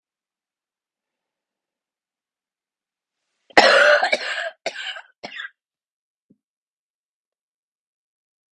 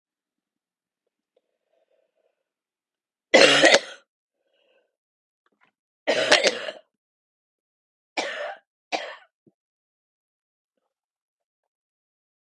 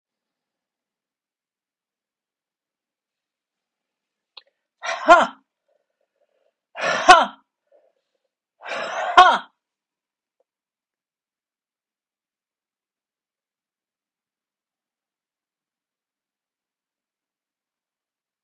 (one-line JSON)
{"cough_length": "8.5 s", "cough_amplitude": 30863, "cough_signal_mean_std_ratio": 0.24, "three_cough_length": "12.5 s", "three_cough_amplitude": 31997, "three_cough_signal_mean_std_ratio": 0.23, "exhalation_length": "18.4 s", "exhalation_amplitude": 32138, "exhalation_signal_mean_std_ratio": 0.17, "survey_phase": "beta (2021-08-13 to 2022-03-07)", "age": "45-64", "gender": "Female", "wearing_mask": "No", "symptom_cough_any": true, "symptom_runny_or_blocked_nose": true, "symptom_fever_high_temperature": true, "symptom_headache": true, "symptom_other": true, "symptom_onset": "3 days", "smoker_status": "Never smoked", "respiratory_condition_asthma": false, "respiratory_condition_other": false, "recruitment_source": "Test and Trace", "submission_delay": "2 days", "covid_test_result": "Positive", "covid_test_method": "RT-qPCR", "covid_ct_value": 13.6, "covid_ct_gene": "N gene"}